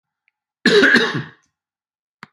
{"cough_length": "2.3 s", "cough_amplitude": 32768, "cough_signal_mean_std_ratio": 0.39, "survey_phase": "beta (2021-08-13 to 2022-03-07)", "age": "65+", "gender": "Male", "wearing_mask": "No", "symptom_none": true, "smoker_status": "Never smoked", "respiratory_condition_asthma": false, "respiratory_condition_other": true, "recruitment_source": "REACT", "submission_delay": "3 days", "covid_test_result": "Negative", "covid_test_method": "RT-qPCR", "influenza_a_test_result": "Negative", "influenza_b_test_result": "Negative"}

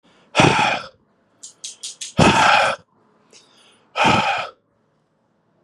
{"exhalation_length": "5.6 s", "exhalation_amplitude": 32098, "exhalation_signal_mean_std_ratio": 0.44, "survey_phase": "beta (2021-08-13 to 2022-03-07)", "age": "45-64", "gender": "Male", "wearing_mask": "No", "symptom_cough_any": true, "symptom_runny_or_blocked_nose": true, "symptom_sore_throat": true, "symptom_onset": "7 days", "smoker_status": "Ex-smoker", "respiratory_condition_asthma": false, "respiratory_condition_other": false, "recruitment_source": "REACT", "submission_delay": "2 days", "covid_test_result": "Negative", "covid_test_method": "RT-qPCR"}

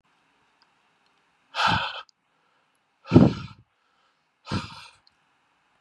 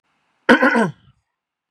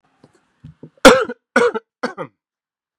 {"exhalation_length": "5.8 s", "exhalation_amplitude": 29277, "exhalation_signal_mean_std_ratio": 0.25, "cough_length": "1.7 s", "cough_amplitude": 32767, "cough_signal_mean_std_ratio": 0.36, "three_cough_length": "3.0 s", "three_cough_amplitude": 32768, "three_cough_signal_mean_std_ratio": 0.28, "survey_phase": "beta (2021-08-13 to 2022-03-07)", "age": "18-44", "gender": "Male", "wearing_mask": "No", "symptom_none": true, "symptom_onset": "6 days", "smoker_status": "Ex-smoker", "respiratory_condition_asthma": false, "respiratory_condition_other": false, "recruitment_source": "REACT", "submission_delay": "5 days", "covid_test_result": "Positive", "covid_test_method": "RT-qPCR", "covid_ct_value": 35.3, "covid_ct_gene": "E gene", "influenza_a_test_result": "Negative", "influenza_b_test_result": "Negative"}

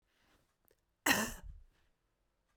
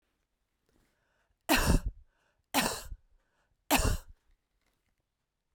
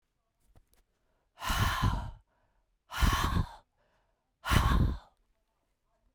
{"cough_length": "2.6 s", "cough_amplitude": 5513, "cough_signal_mean_std_ratio": 0.27, "three_cough_length": "5.5 s", "three_cough_amplitude": 8102, "three_cough_signal_mean_std_ratio": 0.32, "exhalation_length": "6.1 s", "exhalation_amplitude": 8922, "exhalation_signal_mean_std_ratio": 0.42, "survey_phase": "beta (2021-08-13 to 2022-03-07)", "age": "45-64", "gender": "Female", "wearing_mask": "No", "symptom_cough_any": true, "symptom_runny_or_blocked_nose": true, "symptom_sore_throat": true, "symptom_fatigue": true, "symptom_change_to_sense_of_smell_or_taste": true, "symptom_onset": "3 days", "smoker_status": "Ex-smoker", "respiratory_condition_asthma": false, "respiratory_condition_other": false, "recruitment_source": "Test and Trace", "submission_delay": "2 days", "covid_test_result": "Positive", "covid_test_method": "RT-qPCR", "covid_ct_value": 23.9, "covid_ct_gene": "ORF1ab gene", "covid_ct_mean": 24.7, "covid_viral_load": "7900 copies/ml", "covid_viral_load_category": "Minimal viral load (< 10K copies/ml)"}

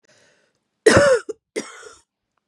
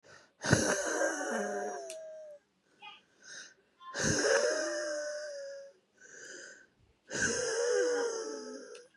{"cough_length": "2.5 s", "cough_amplitude": 31263, "cough_signal_mean_std_ratio": 0.33, "exhalation_length": "9.0 s", "exhalation_amplitude": 10712, "exhalation_signal_mean_std_ratio": 0.66, "survey_phase": "beta (2021-08-13 to 2022-03-07)", "age": "45-64", "gender": "Female", "wearing_mask": "No", "symptom_runny_or_blocked_nose": true, "symptom_headache": true, "symptom_other": true, "smoker_status": "Current smoker (11 or more cigarettes per day)", "respiratory_condition_asthma": false, "respiratory_condition_other": true, "recruitment_source": "Test and Trace", "submission_delay": "2 days", "covid_test_result": "Positive", "covid_test_method": "RT-qPCR", "covid_ct_value": 22.1, "covid_ct_gene": "ORF1ab gene", "covid_ct_mean": 22.5, "covid_viral_load": "43000 copies/ml", "covid_viral_load_category": "Low viral load (10K-1M copies/ml)"}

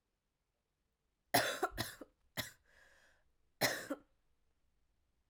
{"cough_length": "5.3 s", "cough_amplitude": 5027, "cough_signal_mean_std_ratio": 0.29, "survey_phase": "alpha (2021-03-01 to 2021-08-12)", "age": "18-44", "gender": "Female", "wearing_mask": "No", "symptom_new_continuous_cough": true, "symptom_fatigue": true, "symptom_headache": true, "symptom_change_to_sense_of_smell_or_taste": true, "smoker_status": "Never smoked", "respiratory_condition_asthma": false, "respiratory_condition_other": false, "recruitment_source": "Test and Trace", "submission_delay": "1 day", "covid_test_result": "Positive", "covid_test_method": "RT-qPCR"}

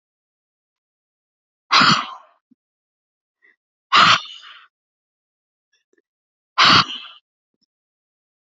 {"exhalation_length": "8.4 s", "exhalation_amplitude": 31264, "exhalation_signal_mean_std_ratio": 0.26, "survey_phase": "alpha (2021-03-01 to 2021-08-12)", "age": "18-44", "gender": "Female", "wearing_mask": "No", "symptom_none": true, "smoker_status": "Ex-smoker", "respiratory_condition_asthma": false, "respiratory_condition_other": false, "recruitment_source": "REACT", "submission_delay": "1 day", "covid_test_result": "Negative", "covid_test_method": "RT-qPCR"}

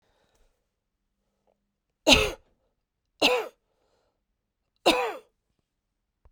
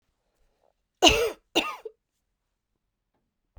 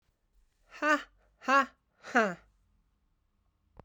{"three_cough_length": "6.3 s", "three_cough_amplitude": 25300, "three_cough_signal_mean_std_ratio": 0.25, "cough_length": "3.6 s", "cough_amplitude": 29365, "cough_signal_mean_std_ratio": 0.25, "exhalation_length": "3.8 s", "exhalation_amplitude": 8412, "exhalation_signal_mean_std_ratio": 0.3, "survey_phase": "beta (2021-08-13 to 2022-03-07)", "age": "45-64", "gender": "Female", "wearing_mask": "No", "symptom_cough_any": true, "symptom_sore_throat": true, "symptom_fatigue": true, "symptom_headache": true, "symptom_onset": "3 days", "smoker_status": "Never smoked", "respiratory_condition_asthma": true, "respiratory_condition_other": false, "recruitment_source": "Test and Trace", "submission_delay": "3 days", "covid_test_result": "Positive", "covid_test_method": "RT-qPCR", "covid_ct_value": 16.4, "covid_ct_gene": "ORF1ab gene", "covid_ct_mean": 17.5, "covid_viral_load": "1900000 copies/ml", "covid_viral_load_category": "High viral load (>1M copies/ml)"}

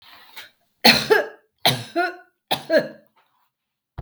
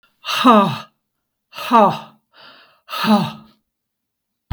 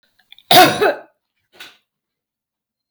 {"three_cough_length": "4.0 s", "three_cough_amplitude": 32768, "three_cough_signal_mean_std_ratio": 0.36, "exhalation_length": "4.5 s", "exhalation_amplitude": 32766, "exhalation_signal_mean_std_ratio": 0.39, "cough_length": "2.9 s", "cough_amplitude": 32768, "cough_signal_mean_std_ratio": 0.3, "survey_phase": "beta (2021-08-13 to 2022-03-07)", "age": "65+", "gender": "Female", "wearing_mask": "No", "symptom_none": true, "smoker_status": "Ex-smoker", "respiratory_condition_asthma": false, "respiratory_condition_other": false, "recruitment_source": "REACT", "submission_delay": "6 days", "covid_test_result": "Negative", "covid_test_method": "RT-qPCR", "influenza_a_test_result": "Negative", "influenza_b_test_result": "Negative"}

